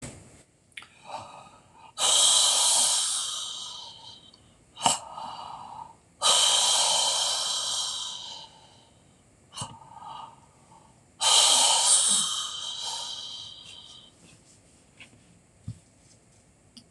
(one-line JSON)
{"exhalation_length": "16.9 s", "exhalation_amplitude": 24006, "exhalation_signal_mean_std_ratio": 0.51, "survey_phase": "beta (2021-08-13 to 2022-03-07)", "age": "65+", "gender": "Male", "wearing_mask": "No", "symptom_cough_any": true, "symptom_runny_or_blocked_nose": true, "symptom_fatigue": true, "symptom_change_to_sense_of_smell_or_taste": true, "smoker_status": "Never smoked", "respiratory_condition_asthma": true, "respiratory_condition_other": false, "recruitment_source": "Test and Trace", "submission_delay": "1 day", "covid_test_result": "Positive", "covid_test_method": "LFT"}